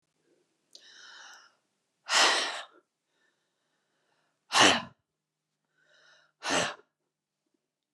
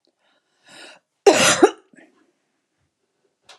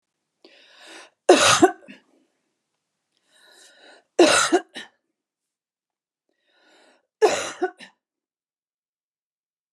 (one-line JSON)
{"exhalation_length": "7.9 s", "exhalation_amplitude": 18132, "exhalation_signal_mean_std_ratio": 0.28, "cough_length": "3.6 s", "cough_amplitude": 32094, "cough_signal_mean_std_ratio": 0.26, "three_cough_length": "9.7 s", "three_cough_amplitude": 29470, "three_cough_signal_mean_std_ratio": 0.26, "survey_phase": "beta (2021-08-13 to 2022-03-07)", "age": "65+", "gender": "Female", "wearing_mask": "No", "symptom_none": true, "smoker_status": "Ex-smoker", "respiratory_condition_asthma": false, "respiratory_condition_other": false, "recruitment_source": "REACT", "submission_delay": "2 days", "covid_test_result": "Negative", "covid_test_method": "RT-qPCR", "influenza_a_test_result": "Negative", "influenza_b_test_result": "Negative"}